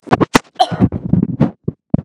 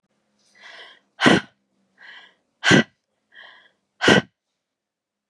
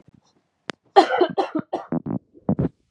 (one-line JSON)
{"cough_length": "2.0 s", "cough_amplitude": 32768, "cough_signal_mean_std_ratio": 0.48, "exhalation_length": "5.3 s", "exhalation_amplitude": 32587, "exhalation_signal_mean_std_ratio": 0.27, "three_cough_length": "2.9 s", "three_cough_amplitude": 32298, "three_cough_signal_mean_std_ratio": 0.39, "survey_phase": "beta (2021-08-13 to 2022-03-07)", "age": "18-44", "gender": "Female", "wearing_mask": "No", "symptom_cough_any": true, "symptom_runny_or_blocked_nose": true, "symptom_fatigue": true, "symptom_headache": true, "symptom_onset": "3 days", "smoker_status": "Ex-smoker", "respiratory_condition_asthma": false, "respiratory_condition_other": false, "recruitment_source": "Test and Trace", "submission_delay": "2 days", "covid_test_result": "Positive", "covid_test_method": "RT-qPCR", "covid_ct_value": 12.4, "covid_ct_gene": "ORF1ab gene"}